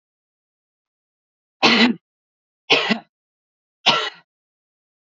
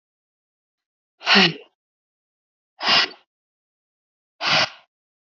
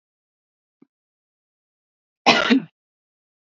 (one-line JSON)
{"three_cough_length": "5.0 s", "three_cough_amplitude": 29866, "three_cough_signal_mean_std_ratio": 0.3, "exhalation_length": "5.3 s", "exhalation_amplitude": 25731, "exhalation_signal_mean_std_ratio": 0.3, "cough_length": "3.4 s", "cough_amplitude": 29589, "cough_signal_mean_std_ratio": 0.24, "survey_phase": "alpha (2021-03-01 to 2021-08-12)", "age": "18-44", "gender": "Female", "wearing_mask": "No", "symptom_none": true, "smoker_status": "Never smoked", "respiratory_condition_asthma": false, "respiratory_condition_other": false, "recruitment_source": "REACT", "submission_delay": "2 days", "covid_test_result": "Negative", "covid_test_method": "RT-qPCR"}